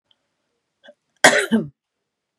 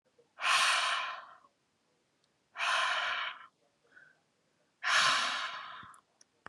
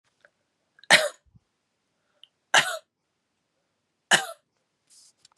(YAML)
cough_length: 2.4 s
cough_amplitude: 32768
cough_signal_mean_std_ratio: 0.27
exhalation_length: 6.5 s
exhalation_amplitude: 6010
exhalation_signal_mean_std_ratio: 0.51
three_cough_length: 5.4 s
three_cough_amplitude: 27101
three_cough_signal_mean_std_ratio: 0.21
survey_phase: beta (2021-08-13 to 2022-03-07)
age: 18-44
gender: Female
wearing_mask: 'No'
symptom_none: true
smoker_status: Prefer not to say
respiratory_condition_asthma: false
respiratory_condition_other: false
recruitment_source: REACT
submission_delay: 4 days
covid_test_result: Negative
covid_test_method: RT-qPCR
influenza_a_test_result: Negative
influenza_b_test_result: Negative